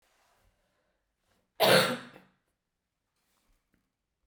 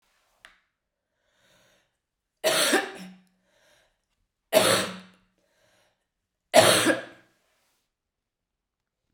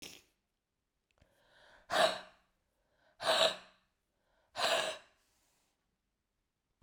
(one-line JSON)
{"cough_length": "4.3 s", "cough_amplitude": 11415, "cough_signal_mean_std_ratio": 0.23, "three_cough_length": "9.1 s", "three_cough_amplitude": 23833, "three_cough_signal_mean_std_ratio": 0.29, "exhalation_length": "6.8 s", "exhalation_amplitude": 5838, "exhalation_signal_mean_std_ratio": 0.3, "survey_phase": "beta (2021-08-13 to 2022-03-07)", "age": "18-44", "gender": "Female", "wearing_mask": "No", "symptom_cough_any": true, "symptom_runny_or_blocked_nose": true, "symptom_headache": true, "symptom_onset": "3 days", "smoker_status": "Never smoked", "respiratory_condition_asthma": false, "respiratory_condition_other": false, "recruitment_source": "Test and Trace", "submission_delay": "2 days", "covid_test_result": "Positive", "covid_test_method": "RT-qPCR", "covid_ct_value": 16.8, "covid_ct_gene": "ORF1ab gene", "covid_ct_mean": 17.0, "covid_viral_load": "2600000 copies/ml", "covid_viral_load_category": "High viral load (>1M copies/ml)"}